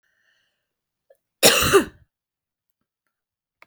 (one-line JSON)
{"cough_length": "3.7 s", "cough_amplitude": 32768, "cough_signal_mean_std_ratio": 0.25, "survey_phase": "beta (2021-08-13 to 2022-03-07)", "age": "45-64", "gender": "Female", "wearing_mask": "No", "symptom_cough_any": true, "symptom_runny_or_blocked_nose": true, "symptom_fatigue": true, "symptom_onset": "3 days", "smoker_status": "Never smoked", "respiratory_condition_asthma": false, "respiratory_condition_other": false, "recruitment_source": "Test and Trace", "submission_delay": "2 days", "covid_test_result": "Positive", "covid_test_method": "RT-qPCR", "covid_ct_value": 17.3, "covid_ct_gene": "ORF1ab gene", "covid_ct_mean": 18.4, "covid_viral_load": "960000 copies/ml", "covid_viral_load_category": "Low viral load (10K-1M copies/ml)"}